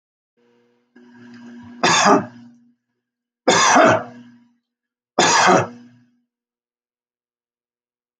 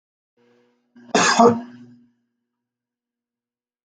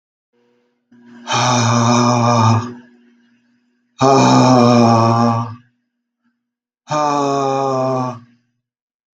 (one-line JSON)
{"three_cough_length": "8.2 s", "three_cough_amplitude": 32674, "three_cough_signal_mean_std_ratio": 0.36, "cough_length": "3.8 s", "cough_amplitude": 30121, "cough_signal_mean_std_ratio": 0.27, "exhalation_length": "9.1 s", "exhalation_amplitude": 32669, "exhalation_signal_mean_std_ratio": 0.59, "survey_phase": "beta (2021-08-13 to 2022-03-07)", "age": "65+", "gender": "Male", "wearing_mask": "No", "symptom_none": true, "smoker_status": "Ex-smoker", "respiratory_condition_asthma": false, "respiratory_condition_other": false, "recruitment_source": "REACT", "submission_delay": "2 days", "covid_test_result": "Negative", "covid_test_method": "RT-qPCR", "influenza_a_test_result": "Negative", "influenza_b_test_result": "Negative"}